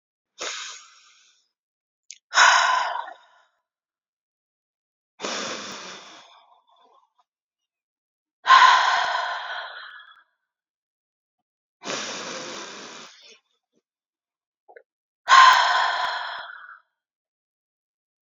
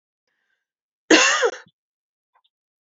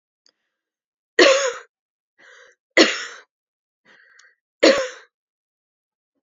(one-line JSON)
{"exhalation_length": "18.3 s", "exhalation_amplitude": 27800, "exhalation_signal_mean_std_ratio": 0.32, "cough_length": "2.8 s", "cough_amplitude": 30578, "cough_signal_mean_std_ratio": 0.29, "three_cough_length": "6.2 s", "three_cough_amplitude": 30696, "three_cough_signal_mean_std_ratio": 0.27, "survey_phase": "beta (2021-08-13 to 2022-03-07)", "age": "65+", "gender": "Female", "wearing_mask": "No", "symptom_none": true, "smoker_status": "Ex-smoker", "respiratory_condition_asthma": false, "respiratory_condition_other": false, "recruitment_source": "REACT", "submission_delay": "2 days", "covid_test_result": "Negative", "covid_test_method": "RT-qPCR", "influenza_a_test_result": "Negative", "influenza_b_test_result": "Negative"}